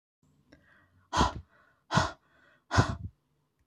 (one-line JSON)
{"exhalation_length": "3.7 s", "exhalation_amplitude": 11661, "exhalation_signal_mean_std_ratio": 0.32, "survey_phase": "beta (2021-08-13 to 2022-03-07)", "age": "45-64", "gender": "Female", "wearing_mask": "No", "symptom_none": true, "smoker_status": "Ex-smoker", "respiratory_condition_asthma": false, "respiratory_condition_other": false, "recruitment_source": "REACT", "submission_delay": "0 days", "covid_test_result": "Negative", "covid_test_method": "RT-qPCR"}